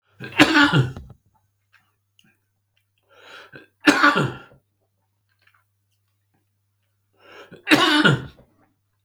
three_cough_length: 9.0 s
three_cough_amplitude: 32768
three_cough_signal_mean_std_ratio: 0.32
survey_phase: beta (2021-08-13 to 2022-03-07)
age: 45-64
gender: Male
wearing_mask: 'No'
symptom_cough_any: true
symptom_fatigue: true
symptom_onset: 3 days
smoker_status: Never smoked
respiratory_condition_asthma: true
respiratory_condition_other: false
recruitment_source: Test and Trace
submission_delay: 1 day
covid_test_result: Positive
covid_test_method: RT-qPCR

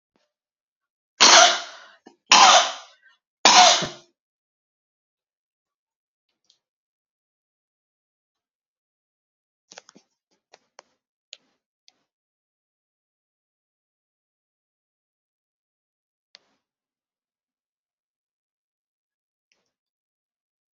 three_cough_length: 20.7 s
three_cough_amplitude: 32767
three_cough_signal_mean_std_ratio: 0.18
survey_phase: beta (2021-08-13 to 2022-03-07)
age: 65+
gender: Female
wearing_mask: 'No'
symptom_none: true
smoker_status: Ex-smoker
respiratory_condition_asthma: false
respiratory_condition_other: false
recruitment_source: REACT
submission_delay: 1 day
covid_test_result: Negative
covid_test_method: RT-qPCR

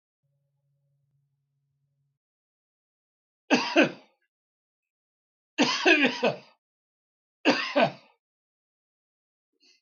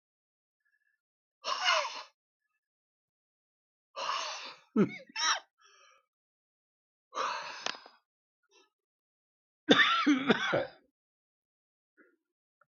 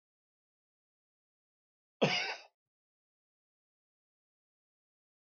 three_cough_length: 9.8 s
three_cough_amplitude: 15589
three_cough_signal_mean_std_ratio: 0.28
exhalation_length: 12.7 s
exhalation_amplitude: 17341
exhalation_signal_mean_std_ratio: 0.33
cough_length: 5.2 s
cough_amplitude: 6132
cough_signal_mean_std_ratio: 0.18
survey_phase: beta (2021-08-13 to 2022-03-07)
age: 65+
gender: Male
wearing_mask: 'No'
symptom_cough_any: true
symptom_runny_or_blocked_nose: true
symptom_shortness_of_breath: true
smoker_status: Ex-smoker
respiratory_condition_asthma: false
respiratory_condition_other: false
recruitment_source: REACT
submission_delay: 2 days
covid_test_result: Negative
covid_test_method: RT-qPCR
influenza_a_test_result: Negative
influenza_b_test_result: Negative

